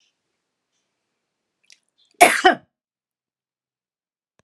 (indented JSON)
{
  "cough_length": "4.4 s",
  "cough_amplitude": 32768,
  "cough_signal_mean_std_ratio": 0.18,
  "survey_phase": "beta (2021-08-13 to 2022-03-07)",
  "age": "65+",
  "gender": "Female",
  "wearing_mask": "No",
  "symptom_shortness_of_breath": true,
  "smoker_status": "Never smoked",
  "respiratory_condition_asthma": false,
  "respiratory_condition_other": true,
  "recruitment_source": "REACT",
  "submission_delay": "1 day",
  "covid_test_result": "Negative",
  "covid_test_method": "RT-qPCR",
  "influenza_a_test_result": "Negative",
  "influenza_b_test_result": "Negative"
}